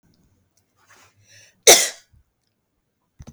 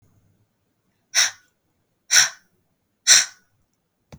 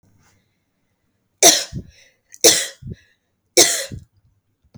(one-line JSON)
{"cough_length": "3.3 s", "cough_amplitude": 32768, "cough_signal_mean_std_ratio": 0.19, "exhalation_length": "4.2 s", "exhalation_amplitude": 32768, "exhalation_signal_mean_std_ratio": 0.26, "three_cough_length": "4.8 s", "three_cough_amplitude": 32768, "three_cough_signal_mean_std_ratio": 0.29, "survey_phase": "beta (2021-08-13 to 2022-03-07)", "age": "18-44", "gender": "Female", "wearing_mask": "No", "symptom_cough_any": true, "symptom_new_continuous_cough": true, "symptom_runny_or_blocked_nose": true, "symptom_fatigue": true, "symptom_headache": true, "symptom_onset": "4 days", "smoker_status": "Never smoked", "respiratory_condition_asthma": false, "respiratory_condition_other": false, "recruitment_source": "REACT", "submission_delay": "1 day", "covid_test_result": "Positive", "covid_test_method": "RT-qPCR", "covid_ct_value": 21.6, "covid_ct_gene": "E gene", "influenza_a_test_result": "Negative", "influenza_b_test_result": "Negative"}